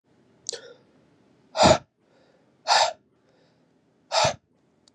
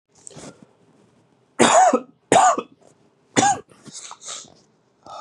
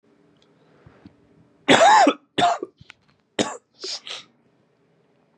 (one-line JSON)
{"exhalation_length": "4.9 s", "exhalation_amplitude": 22894, "exhalation_signal_mean_std_ratio": 0.29, "three_cough_length": "5.2 s", "three_cough_amplitude": 32751, "three_cough_signal_mean_std_ratio": 0.37, "cough_length": "5.4 s", "cough_amplitude": 32767, "cough_signal_mean_std_ratio": 0.33, "survey_phase": "beta (2021-08-13 to 2022-03-07)", "age": "18-44", "gender": "Male", "wearing_mask": "No", "symptom_cough_any": true, "symptom_new_continuous_cough": true, "symptom_runny_or_blocked_nose": true, "symptom_sore_throat": true, "symptom_fatigue": true, "symptom_fever_high_temperature": true, "symptom_onset": "3 days", "smoker_status": "Ex-smoker", "respiratory_condition_asthma": false, "respiratory_condition_other": false, "recruitment_source": "Test and Trace", "submission_delay": "1 day", "covid_test_result": "Positive", "covid_test_method": "RT-qPCR", "covid_ct_value": 18.8, "covid_ct_gene": "ORF1ab gene", "covid_ct_mean": 19.5, "covid_viral_load": "400000 copies/ml", "covid_viral_load_category": "Low viral load (10K-1M copies/ml)"}